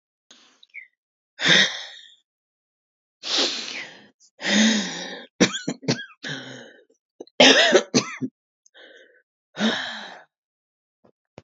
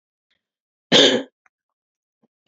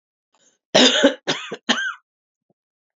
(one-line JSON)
{"exhalation_length": "11.4 s", "exhalation_amplitude": 29239, "exhalation_signal_mean_std_ratio": 0.37, "cough_length": "2.5 s", "cough_amplitude": 29699, "cough_signal_mean_std_ratio": 0.27, "three_cough_length": "3.0 s", "three_cough_amplitude": 32767, "three_cough_signal_mean_std_ratio": 0.37, "survey_phase": "beta (2021-08-13 to 2022-03-07)", "age": "45-64", "gender": "Female", "wearing_mask": "No", "symptom_cough_any": true, "symptom_runny_or_blocked_nose": true, "symptom_shortness_of_breath": true, "symptom_sore_throat": true, "symptom_fatigue": true, "symptom_fever_high_temperature": true, "symptom_headache": true, "symptom_other": true, "symptom_onset": "4 days", "smoker_status": "Ex-smoker", "respiratory_condition_asthma": true, "respiratory_condition_other": false, "recruitment_source": "Test and Trace", "submission_delay": "1 day", "covid_test_result": "Positive", "covid_test_method": "RT-qPCR", "covid_ct_value": 25.1, "covid_ct_gene": "ORF1ab gene", "covid_ct_mean": 25.3, "covid_viral_load": "5100 copies/ml", "covid_viral_load_category": "Minimal viral load (< 10K copies/ml)"}